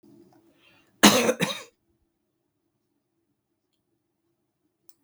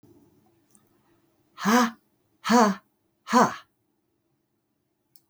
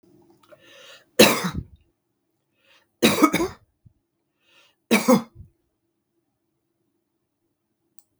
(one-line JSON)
{"cough_length": "5.0 s", "cough_amplitude": 32766, "cough_signal_mean_std_ratio": 0.21, "exhalation_length": "5.3 s", "exhalation_amplitude": 18502, "exhalation_signal_mean_std_ratio": 0.3, "three_cough_length": "8.2 s", "three_cough_amplitude": 32768, "three_cough_signal_mean_std_ratio": 0.26, "survey_phase": "beta (2021-08-13 to 2022-03-07)", "age": "65+", "gender": "Female", "wearing_mask": "No", "symptom_none": true, "smoker_status": "Current smoker (11 or more cigarettes per day)", "respiratory_condition_asthma": false, "respiratory_condition_other": false, "recruitment_source": "REACT", "submission_delay": "2 days", "covid_test_result": "Negative", "covid_test_method": "RT-qPCR", "influenza_a_test_result": "Negative", "influenza_b_test_result": "Negative"}